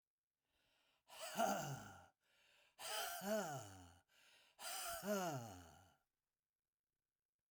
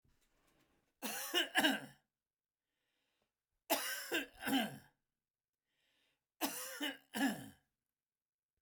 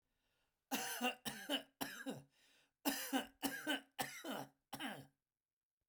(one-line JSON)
{"exhalation_length": "7.5 s", "exhalation_amplitude": 1460, "exhalation_signal_mean_std_ratio": 0.48, "three_cough_length": "8.6 s", "three_cough_amplitude": 3425, "three_cough_signal_mean_std_ratio": 0.39, "cough_length": "5.9 s", "cough_amplitude": 2751, "cough_signal_mean_std_ratio": 0.51, "survey_phase": "beta (2021-08-13 to 2022-03-07)", "age": "65+", "gender": "Male", "wearing_mask": "No", "symptom_fatigue": true, "smoker_status": "Ex-smoker", "respiratory_condition_asthma": false, "respiratory_condition_other": false, "recruitment_source": "REACT", "submission_delay": "1 day", "covid_test_result": "Negative", "covid_test_method": "RT-qPCR"}